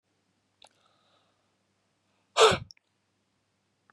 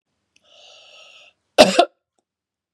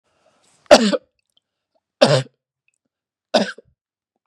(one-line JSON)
{"exhalation_length": "3.9 s", "exhalation_amplitude": 17193, "exhalation_signal_mean_std_ratio": 0.18, "cough_length": "2.7 s", "cough_amplitude": 32768, "cough_signal_mean_std_ratio": 0.22, "three_cough_length": "4.3 s", "three_cough_amplitude": 32768, "three_cough_signal_mean_std_ratio": 0.26, "survey_phase": "beta (2021-08-13 to 2022-03-07)", "age": "18-44", "gender": "Male", "wearing_mask": "No", "symptom_none": true, "smoker_status": "Never smoked", "respiratory_condition_asthma": false, "respiratory_condition_other": false, "recruitment_source": "REACT", "submission_delay": "1 day", "covid_test_result": "Negative", "covid_test_method": "RT-qPCR", "influenza_a_test_result": "Negative", "influenza_b_test_result": "Negative"}